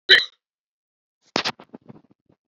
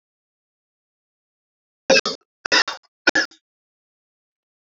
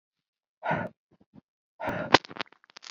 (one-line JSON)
{"cough_length": "2.5 s", "cough_amplitude": 29551, "cough_signal_mean_std_ratio": 0.22, "three_cough_length": "4.7 s", "three_cough_amplitude": 26079, "three_cough_signal_mean_std_ratio": 0.23, "exhalation_length": "2.9 s", "exhalation_amplitude": 26739, "exhalation_signal_mean_std_ratio": 0.25, "survey_phase": "alpha (2021-03-01 to 2021-08-12)", "age": "45-64", "gender": "Male", "wearing_mask": "No", "symptom_cough_any": true, "symptom_new_continuous_cough": true, "symptom_abdominal_pain": true, "symptom_fatigue": true, "symptom_headache": true, "symptom_onset": "3 days", "smoker_status": "Never smoked", "respiratory_condition_asthma": false, "respiratory_condition_other": false, "recruitment_source": "Test and Trace", "submission_delay": "1 day", "covid_test_result": "Positive", "covid_test_method": "RT-qPCR", "covid_ct_value": 26.1, "covid_ct_gene": "ORF1ab gene", "covid_ct_mean": 27.2, "covid_viral_load": "1200 copies/ml", "covid_viral_load_category": "Minimal viral load (< 10K copies/ml)"}